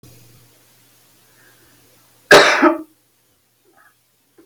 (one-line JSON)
{"cough_length": "4.5 s", "cough_amplitude": 32768, "cough_signal_mean_std_ratio": 0.26, "survey_phase": "alpha (2021-03-01 to 2021-08-12)", "age": "45-64", "gender": "Female", "wearing_mask": "No", "symptom_none": true, "symptom_onset": "8 days", "smoker_status": "Never smoked", "respiratory_condition_asthma": false, "respiratory_condition_other": false, "recruitment_source": "REACT", "submission_delay": "1 day", "covid_test_result": "Negative", "covid_test_method": "RT-qPCR"}